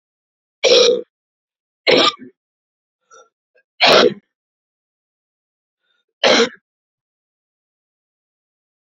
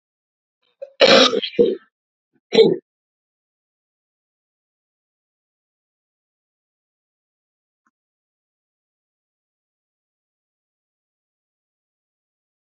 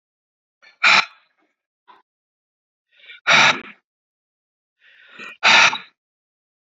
{"three_cough_length": "9.0 s", "three_cough_amplitude": 32106, "three_cough_signal_mean_std_ratio": 0.3, "cough_length": "12.6 s", "cough_amplitude": 30250, "cough_signal_mean_std_ratio": 0.19, "exhalation_length": "6.7 s", "exhalation_amplitude": 28805, "exhalation_signal_mean_std_ratio": 0.29, "survey_phase": "beta (2021-08-13 to 2022-03-07)", "age": "45-64", "gender": "Male", "wearing_mask": "Yes", "symptom_new_continuous_cough": true, "smoker_status": "Ex-smoker", "respiratory_condition_asthma": false, "respiratory_condition_other": false, "recruitment_source": "Test and Trace", "submission_delay": "2 days", "covid_test_result": "Positive", "covid_test_method": "RT-qPCR", "covid_ct_value": 14.0, "covid_ct_gene": "ORF1ab gene", "covid_ct_mean": 14.5, "covid_viral_load": "17000000 copies/ml", "covid_viral_load_category": "High viral load (>1M copies/ml)"}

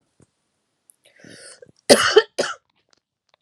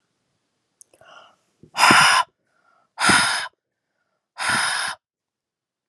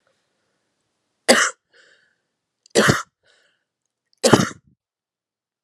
{"cough_length": "3.4 s", "cough_amplitude": 32768, "cough_signal_mean_std_ratio": 0.24, "exhalation_length": "5.9 s", "exhalation_amplitude": 30098, "exhalation_signal_mean_std_ratio": 0.38, "three_cough_length": "5.6 s", "three_cough_amplitude": 32768, "three_cough_signal_mean_std_ratio": 0.26, "survey_phase": "beta (2021-08-13 to 2022-03-07)", "age": "18-44", "gender": "Female", "wearing_mask": "No", "symptom_cough_any": true, "symptom_runny_or_blocked_nose": true, "symptom_fatigue": true, "symptom_headache": true, "symptom_change_to_sense_of_smell_or_taste": true, "symptom_loss_of_taste": true, "symptom_onset": "4 days", "smoker_status": "Never smoked", "respiratory_condition_asthma": false, "respiratory_condition_other": false, "recruitment_source": "Test and Trace", "submission_delay": "1 day", "covid_test_result": "Positive", "covid_test_method": "RT-qPCR", "covid_ct_value": 31.0, "covid_ct_gene": "ORF1ab gene"}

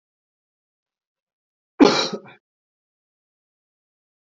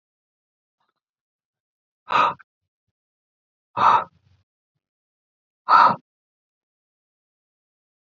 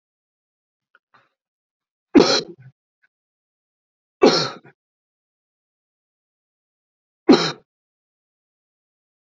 {"cough_length": "4.4 s", "cough_amplitude": 27044, "cough_signal_mean_std_ratio": 0.18, "exhalation_length": "8.1 s", "exhalation_amplitude": 26456, "exhalation_signal_mean_std_ratio": 0.23, "three_cough_length": "9.4 s", "three_cough_amplitude": 28607, "three_cough_signal_mean_std_ratio": 0.2, "survey_phase": "beta (2021-08-13 to 2022-03-07)", "age": "18-44", "gender": "Male", "wearing_mask": "No", "symptom_cough_any": true, "symptom_runny_or_blocked_nose": true, "symptom_fatigue": true, "symptom_onset": "2 days", "smoker_status": "Never smoked", "respiratory_condition_asthma": false, "respiratory_condition_other": false, "recruitment_source": "Test and Trace", "submission_delay": "2 days", "covid_test_result": "Positive", "covid_test_method": "RT-qPCR", "covid_ct_value": 22.0, "covid_ct_gene": "N gene"}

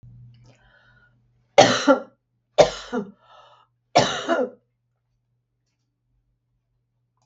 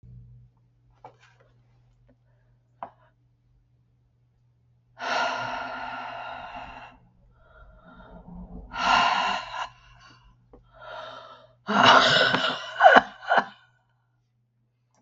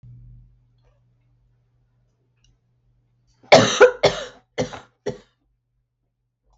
{"three_cough_length": "7.3 s", "three_cough_amplitude": 32768, "three_cough_signal_mean_std_ratio": 0.27, "exhalation_length": "15.0 s", "exhalation_amplitude": 32768, "exhalation_signal_mean_std_ratio": 0.34, "cough_length": "6.6 s", "cough_amplitude": 32768, "cough_signal_mean_std_ratio": 0.22, "survey_phase": "beta (2021-08-13 to 2022-03-07)", "age": "45-64", "gender": "Female", "wearing_mask": "No", "symptom_none": true, "symptom_onset": "2 days", "smoker_status": "Never smoked", "respiratory_condition_asthma": false, "respiratory_condition_other": false, "recruitment_source": "Test and Trace", "submission_delay": "1 day", "covid_test_result": "Negative", "covid_test_method": "RT-qPCR"}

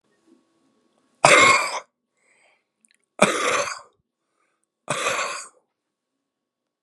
{"exhalation_length": "6.8 s", "exhalation_amplitude": 32768, "exhalation_signal_mean_std_ratio": 0.32, "survey_phase": "beta (2021-08-13 to 2022-03-07)", "age": "45-64", "gender": "Male", "wearing_mask": "No", "symptom_cough_any": true, "symptom_new_continuous_cough": true, "symptom_shortness_of_breath": true, "symptom_sore_throat": true, "symptom_headache": true, "symptom_onset": "4 days", "smoker_status": "Never smoked", "respiratory_condition_asthma": false, "respiratory_condition_other": false, "recruitment_source": "REACT", "submission_delay": "1 day", "covid_test_result": "Negative", "covid_test_method": "RT-qPCR"}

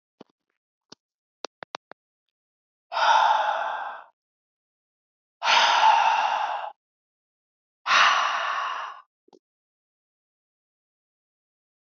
{"exhalation_length": "11.9 s", "exhalation_amplitude": 15526, "exhalation_signal_mean_std_ratio": 0.41, "survey_phase": "beta (2021-08-13 to 2022-03-07)", "age": "18-44", "gender": "Female", "wearing_mask": "No", "symptom_cough_any": true, "symptom_sore_throat": true, "symptom_fatigue": true, "symptom_onset": "1 day", "smoker_status": "Never smoked", "respiratory_condition_asthma": false, "respiratory_condition_other": false, "recruitment_source": "Test and Trace", "submission_delay": "0 days", "covid_test_result": "Negative", "covid_test_method": "RT-qPCR"}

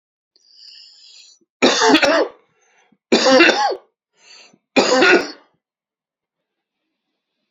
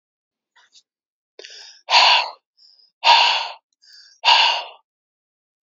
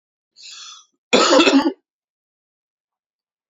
{"three_cough_length": "7.5 s", "three_cough_amplitude": 32767, "three_cough_signal_mean_std_ratio": 0.4, "exhalation_length": "5.6 s", "exhalation_amplitude": 32767, "exhalation_signal_mean_std_ratio": 0.37, "cough_length": "3.5 s", "cough_amplitude": 29347, "cough_signal_mean_std_ratio": 0.34, "survey_phase": "beta (2021-08-13 to 2022-03-07)", "age": "45-64", "gender": "Male", "wearing_mask": "No", "symptom_cough_any": true, "symptom_runny_or_blocked_nose": true, "symptom_sore_throat": true, "smoker_status": "Ex-smoker", "respiratory_condition_asthma": false, "respiratory_condition_other": false, "recruitment_source": "Test and Trace", "submission_delay": "2 days", "covid_test_result": "Positive", "covid_test_method": "RT-qPCR", "covid_ct_value": 39.0, "covid_ct_gene": "ORF1ab gene"}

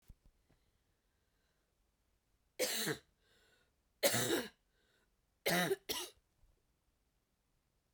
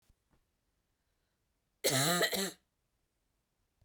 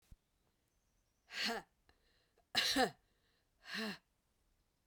{"three_cough_length": "7.9 s", "three_cough_amplitude": 5849, "three_cough_signal_mean_std_ratio": 0.32, "cough_length": "3.8 s", "cough_amplitude": 4551, "cough_signal_mean_std_ratio": 0.33, "exhalation_length": "4.9 s", "exhalation_amplitude": 3115, "exhalation_signal_mean_std_ratio": 0.32, "survey_phase": "beta (2021-08-13 to 2022-03-07)", "age": "45-64", "gender": "Female", "wearing_mask": "No", "symptom_cough_any": true, "symptom_runny_or_blocked_nose": true, "symptom_sore_throat": true, "symptom_abdominal_pain": true, "symptom_fatigue": true, "symptom_fever_high_temperature": true, "symptom_headache": true, "symptom_other": true, "symptom_onset": "2 days", "smoker_status": "Never smoked", "respiratory_condition_asthma": false, "respiratory_condition_other": false, "recruitment_source": "Test and Trace", "submission_delay": "1 day", "covid_test_result": "Positive", "covid_test_method": "LAMP"}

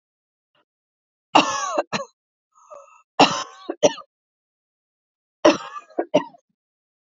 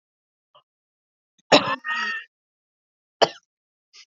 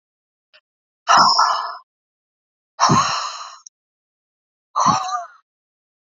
{"three_cough_length": "7.1 s", "three_cough_amplitude": 28645, "three_cough_signal_mean_std_ratio": 0.28, "cough_length": "4.1 s", "cough_amplitude": 30949, "cough_signal_mean_std_ratio": 0.24, "exhalation_length": "6.1 s", "exhalation_amplitude": 31198, "exhalation_signal_mean_std_ratio": 0.4, "survey_phase": "beta (2021-08-13 to 2022-03-07)", "age": "18-44", "gender": "Female", "wearing_mask": "No", "symptom_cough_any": true, "symptom_runny_or_blocked_nose": true, "symptom_shortness_of_breath": true, "symptom_fatigue": true, "symptom_headache": true, "symptom_onset": "5 days", "smoker_status": "Never smoked", "respiratory_condition_asthma": true, "respiratory_condition_other": false, "recruitment_source": "Test and Trace", "submission_delay": "2 days", "covid_test_result": "Positive", "covid_test_method": "RT-qPCR", "covid_ct_value": 17.1, "covid_ct_gene": "ORF1ab gene", "covid_ct_mean": 17.2, "covid_viral_load": "2300000 copies/ml", "covid_viral_load_category": "High viral load (>1M copies/ml)"}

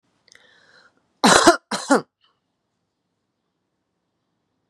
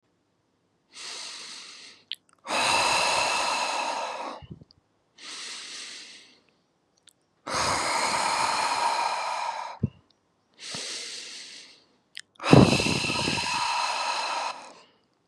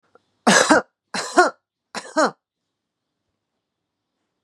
{"cough_length": "4.7 s", "cough_amplitude": 32767, "cough_signal_mean_std_ratio": 0.24, "exhalation_length": "15.3 s", "exhalation_amplitude": 29520, "exhalation_signal_mean_std_ratio": 0.55, "three_cough_length": "4.4 s", "three_cough_amplitude": 32728, "three_cough_signal_mean_std_ratio": 0.3, "survey_phase": "beta (2021-08-13 to 2022-03-07)", "age": "18-44", "gender": "Female", "wearing_mask": "No", "symptom_none": true, "smoker_status": "Current smoker (1 to 10 cigarettes per day)", "respiratory_condition_asthma": false, "respiratory_condition_other": false, "recruitment_source": "REACT", "submission_delay": "2 days", "covid_test_result": "Negative", "covid_test_method": "RT-qPCR", "influenza_a_test_result": "Negative", "influenza_b_test_result": "Negative"}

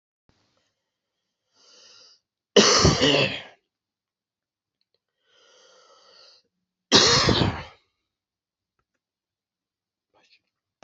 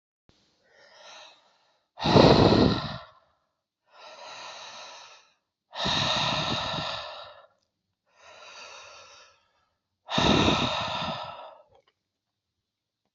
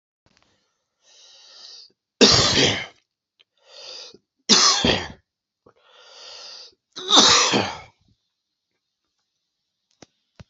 {"cough_length": "10.8 s", "cough_amplitude": 26367, "cough_signal_mean_std_ratio": 0.28, "exhalation_length": "13.1 s", "exhalation_amplitude": 24650, "exhalation_signal_mean_std_ratio": 0.38, "three_cough_length": "10.5 s", "three_cough_amplitude": 32768, "three_cough_signal_mean_std_ratio": 0.34, "survey_phase": "alpha (2021-03-01 to 2021-08-12)", "age": "45-64", "gender": "Male", "wearing_mask": "No", "symptom_cough_any": true, "symptom_shortness_of_breath": true, "symptom_fever_high_temperature": true, "symptom_headache": true, "smoker_status": "Never smoked", "respiratory_condition_asthma": false, "respiratory_condition_other": false, "recruitment_source": "Test and Trace", "submission_delay": "1 day", "covid_test_result": "Positive", "covid_test_method": "RT-qPCR"}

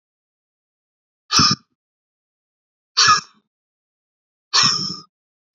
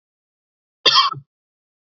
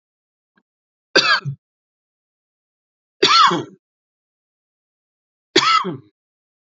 {"exhalation_length": "5.5 s", "exhalation_amplitude": 28922, "exhalation_signal_mean_std_ratio": 0.3, "cough_length": "1.9 s", "cough_amplitude": 30786, "cough_signal_mean_std_ratio": 0.29, "three_cough_length": "6.7 s", "three_cough_amplitude": 32174, "three_cough_signal_mean_std_ratio": 0.3, "survey_phase": "beta (2021-08-13 to 2022-03-07)", "age": "18-44", "gender": "Male", "wearing_mask": "No", "symptom_cough_any": true, "smoker_status": "Never smoked", "respiratory_condition_asthma": true, "respiratory_condition_other": false, "recruitment_source": "REACT", "submission_delay": "1 day", "covid_test_result": "Negative", "covid_test_method": "RT-qPCR", "influenza_a_test_result": "Negative", "influenza_b_test_result": "Negative"}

